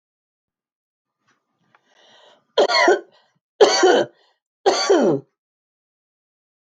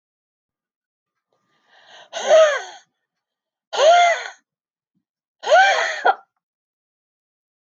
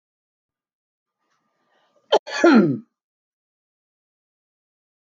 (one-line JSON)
{"three_cough_length": "6.7 s", "three_cough_amplitude": 32350, "three_cough_signal_mean_std_ratio": 0.36, "exhalation_length": "7.7 s", "exhalation_amplitude": 24336, "exhalation_signal_mean_std_ratio": 0.36, "cough_length": "5.0 s", "cough_amplitude": 23988, "cough_signal_mean_std_ratio": 0.24, "survey_phase": "beta (2021-08-13 to 2022-03-07)", "age": "45-64", "gender": "Female", "wearing_mask": "No", "symptom_headache": true, "symptom_onset": "9 days", "smoker_status": "Current smoker (1 to 10 cigarettes per day)", "respiratory_condition_asthma": false, "respiratory_condition_other": true, "recruitment_source": "REACT", "submission_delay": "0 days", "covid_test_result": "Positive", "covid_test_method": "RT-qPCR", "covid_ct_value": 24.0, "covid_ct_gene": "E gene", "influenza_a_test_result": "Negative", "influenza_b_test_result": "Negative"}